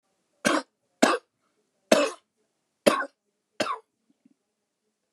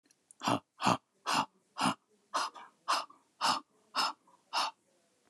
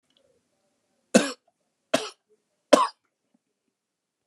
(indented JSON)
{
  "cough_length": "5.1 s",
  "cough_amplitude": 26222,
  "cough_signal_mean_std_ratio": 0.28,
  "exhalation_length": "5.3 s",
  "exhalation_amplitude": 8477,
  "exhalation_signal_mean_std_ratio": 0.43,
  "three_cough_length": "4.3 s",
  "three_cough_amplitude": 28092,
  "three_cough_signal_mean_std_ratio": 0.19,
  "survey_phase": "alpha (2021-03-01 to 2021-08-12)",
  "age": "65+",
  "gender": "Male",
  "wearing_mask": "No",
  "symptom_none": true,
  "smoker_status": "Never smoked",
  "respiratory_condition_asthma": false,
  "respiratory_condition_other": false,
  "recruitment_source": "REACT",
  "submission_delay": "3 days",
  "covid_test_result": "Negative",
  "covid_test_method": "RT-qPCR"
}